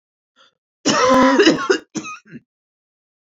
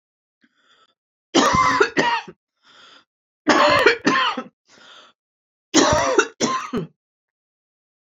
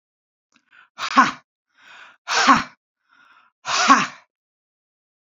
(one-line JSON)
{"cough_length": "3.2 s", "cough_amplitude": 29745, "cough_signal_mean_std_ratio": 0.45, "three_cough_length": "8.1 s", "three_cough_amplitude": 30446, "three_cough_signal_mean_std_ratio": 0.45, "exhalation_length": "5.2 s", "exhalation_amplitude": 31573, "exhalation_signal_mean_std_ratio": 0.32, "survey_phase": "beta (2021-08-13 to 2022-03-07)", "age": "65+", "gender": "Female", "wearing_mask": "No", "symptom_none": true, "smoker_status": "Ex-smoker", "respiratory_condition_asthma": false, "respiratory_condition_other": false, "recruitment_source": "REACT", "submission_delay": "3 days", "covid_test_result": "Negative", "covid_test_method": "RT-qPCR", "influenza_a_test_result": "Negative", "influenza_b_test_result": "Negative"}